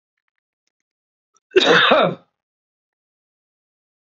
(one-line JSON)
{"cough_length": "4.0 s", "cough_amplitude": 28158, "cough_signal_mean_std_ratio": 0.3, "survey_phase": "beta (2021-08-13 to 2022-03-07)", "age": "45-64", "gender": "Male", "wearing_mask": "No", "symptom_none": true, "smoker_status": "Ex-smoker", "respiratory_condition_asthma": false, "respiratory_condition_other": false, "recruitment_source": "REACT", "submission_delay": "1 day", "covid_test_result": "Negative", "covid_test_method": "RT-qPCR", "influenza_a_test_result": "Negative", "influenza_b_test_result": "Negative"}